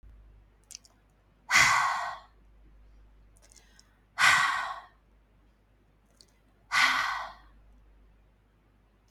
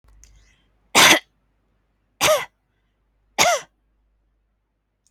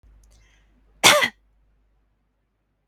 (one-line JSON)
{"exhalation_length": "9.1 s", "exhalation_amplitude": 14293, "exhalation_signal_mean_std_ratio": 0.36, "three_cough_length": "5.1 s", "three_cough_amplitude": 32768, "three_cough_signal_mean_std_ratio": 0.28, "cough_length": "2.9 s", "cough_amplitude": 32768, "cough_signal_mean_std_ratio": 0.23, "survey_phase": "beta (2021-08-13 to 2022-03-07)", "age": "18-44", "gender": "Female", "wearing_mask": "No", "symptom_none": true, "smoker_status": "Never smoked", "respiratory_condition_asthma": false, "respiratory_condition_other": false, "recruitment_source": "REACT", "submission_delay": "1 day", "covid_test_result": "Negative", "covid_test_method": "RT-qPCR"}